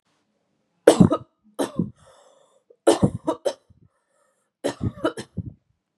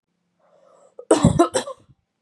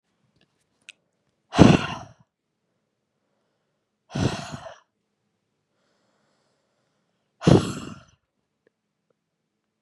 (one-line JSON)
{"three_cough_length": "6.0 s", "three_cough_amplitude": 32767, "three_cough_signal_mean_std_ratio": 0.28, "cough_length": "2.2 s", "cough_amplitude": 29551, "cough_signal_mean_std_ratio": 0.33, "exhalation_length": "9.8 s", "exhalation_amplitude": 32768, "exhalation_signal_mean_std_ratio": 0.2, "survey_phase": "beta (2021-08-13 to 2022-03-07)", "age": "18-44", "gender": "Female", "wearing_mask": "No", "symptom_none": true, "symptom_onset": "5 days", "smoker_status": "Never smoked", "respiratory_condition_asthma": true, "respiratory_condition_other": false, "recruitment_source": "REACT", "submission_delay": "1 day", "covid_test_result": "Negative", "covid_test_method": "RT-qPCR", "influenza_a_test_result": "Negative", "influenza_b_test_result": "Negative"}